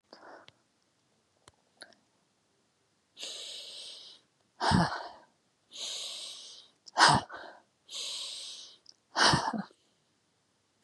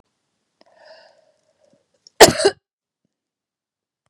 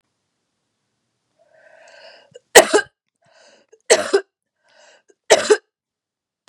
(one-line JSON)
{"exhalation_length": "10.8 s", "exhalation_amplitude": 14091, "exhalation_signal_mean_std_ratio": 0.32, "cough_length": "4.1 s", "cough_amplitude": 32768, "cough_signal_mean_std_ratio": 0.17, "three_cough_length": "6.5 s", "three_cough_amplitude": 32768, "three_cough_signal_mean_std_ratio": 0.23, "survey_phase": "beta (2021-08-13 to 2022-03-07)", "age": "45-64", "gender": "Female", "wearing_mask": "No", "symptom_cough_any": true, "symptom_runny_or_blocked_nose": true, "symptom_sore_throat": true, "symptom_onset": "2 days", "smoker_status": "Never smoked", "respiratory_condition_asthma": false, "respiratory_condition_other": false, "recruitment_source": "Test and Trace", "submission_delay": "1 day", "covid_test_result": "Positive", "covid_test_method": "RT-qPCR", "covid_ct_value": 22.8, "covid_ct_gene": "ORF1ab gene", "covid_ct_mean": 23.1, "covid_viral_load": "26000 copies/ml", "covid_viral_load_category": "Low viral load (10K-1M copies/ml)"}